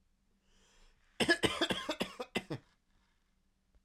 {"three_cough_length": "3.8 s", "three_cough_amplitude": 6003, "three_cough_signal_mean_std_ratio": 0.34, "survey_phase": "beta (2021-08-13 to 2022-03-07)", "age": "18-44", "gender": "Male", "wearing_mask": "No", "symptom_cough_any": true, "symptom_new_continuous_cough": true, "symptom_runny_or_blocked_nose": true, "symptom_sore_throat": true, "symptom_change_to_sense_of_smell_or_taste": true, "symptom_onset": "2 days", "smoker_status": "Never smoked", "respiratory_condition_asthma": false, "respiratory_condition_other": false, "recruitment_source": "Test and Trace", "submission_delay": "1 day", "covid_test_result": "Positive", "covid_test_method": "RT-qPCR", "covid_ct_value": 25.5, "covid_ct_gene": "N gene"}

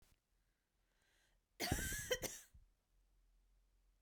{"cough_length": "4.0 s", "cough_amplitude": 2035, "cough_signal_mean_std_ratio": 0.34, "survey_phase": "beta (2021-08-13 to 2022-03-07)", "age": "18-44", "gender": "Female", "wearing_mask": "No", "symptom_cough_any": true, "symptom_new_continuous_cough": true, "smoker_status": "Never smoked", "respiratory_condition_asthma": false, "respiratory_condition_other": false, "recruitment_source": "Test and Trace", "submission_delay": "2 days", "covid_test_result": "Positive", "covid_test_method": "RT-qPCR"}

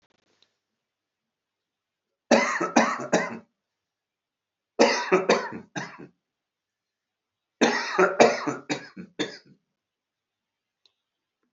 {"three_cough_length": "11.5 s", "three_cough_amplitude": 27130, "three_cough_signal_mean_std_ratio": 0.34, "survey_phase": "alpha (2021-03-01 to 2021-08-12)", "age": "65+", "gender": "Male", "wearing_mask": "No", "symptom_none": true, "smoker_status": "Ex-smoker", "respiratory_condition_asthma": true, "respiratory_condition_other": true, "recruitment_source": "REACT", "submission_delay": "5 days", "covid_test_result": "Negative", "covid_test_method": "RT-qPCR"}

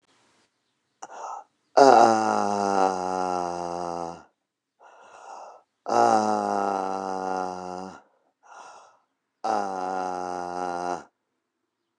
{"exhalation_length": "12.0 s", "exhalation_amplitude": 28554, "exhalation_signal_mean_std_ratio": 0.44, "survey_phase": "beta (2021-08-13 to 2022-03-07)", "age": "45-64", "gender": "Male", "wearing_mask": "No", "symptom_cough_any": true, "symptom_sore_throat": true, "symptom_diarrhoea": true, "symptom_fatigue": true, "symptom_fever_high_temperature": true, "symptom_headache": true, "symptom_other": true, "symptom_onset": "2 days", "smoker_status": "Never smoked", "respiratory_condition_asthma": false, "respiratory_condition_other": false, "recruitment_source": "Test and Trace", "submission_delay": "2 days", "covid_test_result": "Positive", "covid_test_method": "RT-qPCR", "covid_ct_value": 26.1, "covid_ct_gene": "ORF1ab gene"}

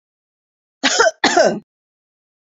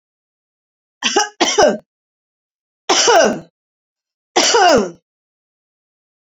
{"cough_length": "2.6 s", "cough_amplitude": 28880, "cough_signal_mean_std_ratio": 0.38, "three_cough_length": "6.2 s", "three_cough_amplitude": 30413, "three_cough_signal_mean_std_ratio": 0.41, "survey_phase": "beta (2021-08-13 to 2022-03-07)", "age": "45-64", "gender": "Female", "wearing_mask": "No", "symptom_none": true, "smoker_status": "Current smoker (11 or more cigarettes per day)", "respiratory_condition_asthma": false, "respiratory_condition_other": false, "recruitment_source": "REACT", "submission_delay": "1 day", "covid_test_result": "Negative", "covid_test_method": "RT-qPCR"}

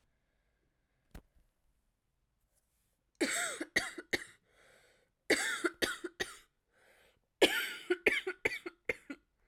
{"three_cough_length": "9.5 s", "three_cough_amplitude": 9711, "three_cough_signal_mean_std_ratio": 0.33, "survey_phase": "beta (2021-08-13 to 2022-03-07)", "age": "18-44", "gender": "Female", "wearing_mask": "No", "symptom_cough_any": true, "symptom_runny_or_blocked_nose": true, "symptom_sore_throat": true, "symptom_fatigue": true, "symptom_headache": true, "symptom_change_to_sense_of_smell_or_taste": true, "symptom_loss_of_taste": true, "symptom_onset": "2 days", "smoker_status": "Never smoked", "respiratory_condition_asthma": false, "respiratory_condition_other": false, "recruitment_source": "Test and Trace", "submission_delay": "2 days", "covid_test_result": "Positive", "covid_test_method": "RT-qPCR", "covid_ct_value": 15.4, "covid_ct_gene": "ORF1ab gene", "covid_ct_mean": 15.9, "covid_viral_load": "5900000 copies/ml", "covid_viral_load_category": "High viral load (>1M copies/ml)"}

